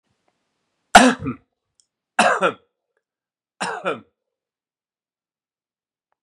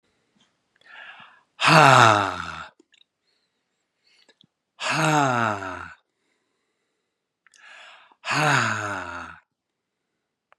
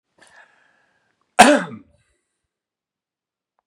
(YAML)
three_cough_length: 6.2 s
three_cough_amplitude: 32768
three_cough_signal_mean_std_ratio: 0.24
exhalation_length: 10.6 s
exhalation_amplitude: 32767
exhalation_signal_mean_std_ratio: 0.34
cough_length: 3.7 s
cough_amplitude: 32768
cough_signal_mean_std_ratio: 0.19
survey_phase: beta (2021-08-13 to 2022-03-07)
age: 45-64
gender: Male
wearing_mask: 'No'
symptom_fatigue: true
symptom_onset: 5 days
smoker_status: Never smoked
respiratory_condition_asthma: false
respiratory_condition_other: false
recruitment_source: Test and Trace
submission_delay: 2 days
covid_test_result: Positive
covid_test_method: RT-qPCR
covid_ct_value: 18.1
covid_ct_gene: N gene